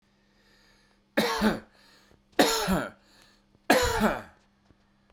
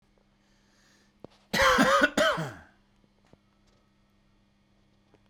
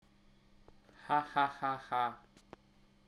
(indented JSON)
{
  "three_cough_length": "5.1 s",
  "three_cough_amplitude": 17189,
  "three_cough_signal_mean_std_ratio": 0.42,
  "cough_length": "5.3 s",
  "cough_amplitude": 13258,
  "cough_signal_mean_std_ratio": 0.34,
  "exhalation_length": "3.1 s",
  "exhalation_amplitude": 4446,
  "exhalation_signal_mean_std_ratio": 0.39,
  "survey_phase": "beta (2021-08-13 to 2022-03-07)",
  "age": "18-44",
  "gender": "Male",
  "wearing_mask": "No",
  "symptom_none": true,
  "smoker_status": "Never smoked",
  "respiratory_condition_asthma": false,
  "respiratory_condition_other": false,
  "recruitment_source": "REACT",
  "submission_delay": "1 day",
  "covid_test_result": "Negative",
  "covid_test_method": "RT-qPCR"
}